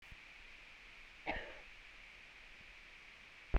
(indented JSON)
{
  "cough_length": "3.6 s",
  "cough_amplitude": 4233,
  "cough_signal_mean_std_ratio": 0.39,
  "survey_phase": "beta (2021-08-13 to 2022-03-07)",
  "age": "45-64",
  "gender": "Female",
  "wearing_mask": "No",
  "symptom_none": true,
  "smoker_status": "Never smoked",
  "respiratory_condition_asthma": false,
  "respiratory_condition_other": false,
  "recruitment_source": "REACT",
  "submission_delay": "2 days",
  "covid_test_result": "Negative",
  "covid_test_method": "RT-qPCR"
}